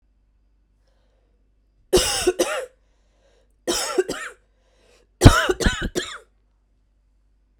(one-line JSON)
{"three_cough_length": "7.6 s", "three_cough_amplitude": 32768, "three_cough_signal_mean_std_ratio": 0.31, "survey_phase": "beta (2021-08-13 to 2022-03-07)", "age": "18-44", "gender": "Female", "wearing_mask": "No", "symptom_cough_any": true, "symptom_runny_or_blocked_nose": true, "symptom_shortness_of_breath": true, "symptom_other": true, "smoker_status": "Ex-smoker", "respiratory_condition_asthma": true, "respiratory_condition_other": false, "recruitment_source": "Test and Trace", "submission_delay": "1 day", "covid_test_result": "Positive", "covid_test_method": "ePCR"}